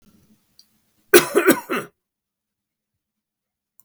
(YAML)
cough_length: 3.8 s
cough_amplitude: 32768
cough_signal_mean_std_ratio: 0.24
survey_phase: beta (2021-08-13 to 2022-03-07)
age: 65+
gender: Male
wearing_mask: 'No'
symptom_none: true
smoker_status: Never smoked
respiratory_condition_asthma: false
respiratory_condition_other: false
recruitment_source: REACT
submission_delay: 3 days
covid_test_result: Negative
covid_test_method: RT-qPCR
influenza_a_test_result: Negative
influenza_b_test_result: Negative